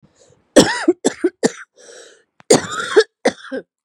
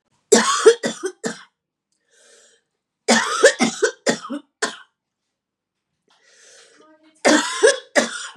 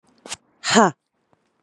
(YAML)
cough_length: 3.8 s
cough_amplitude: 32768
cough_signal_mean_std_ratio: 0.37
three_cough_length: 8.4 s
three_cough_amplitude: 32768
three_cough_signal_mean_std_ratio: 0.37
exhalation_length: 1.6 s
exhalation_amplitude: 31550
exhalation_signal_mean_std_ratio: 0.28
survey_phase: beta (2021-08-13 to 2022-03-07)
age: 18-44
gender: Female
wearing_mask: 'Yes'
symptom_runny_or_blocked_nose: true
symptom_sore_throat: true
symptom_fatigue: true
symptom_fever_high_temperature: true
symptom_headache: true
symptom_loss_of_taste: true
symptom_other: true
smoker_status: Current smoker (11 or more cigarettes per day)
respiratory_condition_asthma: false
respiratory_condition_other: false
recruitment_source: Test and Trace
submission_delay: 2 days
covid_test_result: Positive
covid_test_method: RT-qPCR
covid_ct_value: 23.9
covid_ct_gene: ORF1ab gene